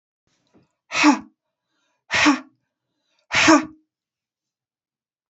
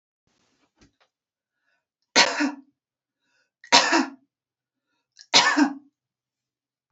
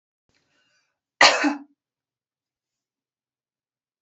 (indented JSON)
{
  "exhalation_length": "5.3 s",
  "exhalation_amplitude": 26525,
  "exhalation_signal_mean_std_ratio": 0.31,
  "three_cough_length": "6.9 s",
  "three_cough_amplitude": 29535,
  "three_cough_signal_mean_std_ratio": 0.29,
  "cough_length": "4.0 s",
  "cough_amplitude": 31673,
  "cough_signal_mean_std_ratio": 0.2,
  "survey_phase": "alpha (2021-03-01 to 2021-08-12)",
  "age": "45-64",
  "gender": "Female",
  "wearing_mask": "No",
  "symptom_fatigue": true,
  "smoker_status": "Ex-smoker",
  "respiratory_condition_asthma": false,
  "respiratory_condition_other": false,
  "recruitment_source": "REACT",
  "submission_delay": "1 day",
  "covid_test_result": "Negative",
  "covid_test_method": "RT-qPCR"
}